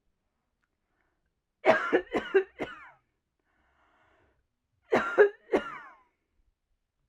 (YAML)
cough_length: 7.1 s
cough_amplitude: 13765
cough_signal_mean_std_ratio: 0.29
survey_phase: alpha (2021-03-01 to 2021-08-12)
age: 18-44
gender: Female
wearing_mask: 'No'
symptom_fatigue: true
symptom_headache: true
symptom_onset: 13 days
smoker_status: Never smoked
respiratory_condition_asthma: true
respiratory_condition_other: false
recruitment_source: REACT
submission_delay: 1 day
covid_test_result: Negative
covid_test_method: RT-qPCR